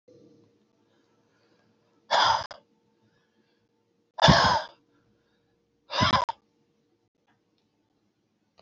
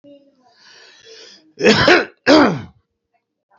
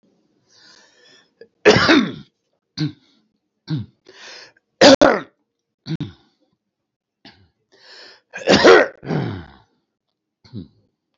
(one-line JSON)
{"exhalation_length": "8.6 s", "exhalation_amplitude": 19651, "exhalation_signal_mean_std_ratio": 0.28, "cough_length": "3.6 s", "cough_amplitude": 32767, "cough_signal_mean_std_ratio": 0.38, "three_cough_length": "11.2 s", "three_cough_amplitude": 30744, "three_cough_signal_mean_std_ratio": 0.3, "survey_phase": "beta (2021-08-13 to 2022-03-07)", "age": "65+", "gender": "Male", "wearing_mask": "No", "symptom_cough_any": true, "symptom_headache": true, "smoker_status": "Ex-smoker", "respiratory_condition_asthma": false, "respiratory_condition_other": true, "recruitment_source": "REACT", "submission_delay": "2 days", "covid_test_result": "Negative", "covid_test_method": "RT-qPCR", "influenza_a_test_result": "Negative", "influenza_b_test_result": "Negative"}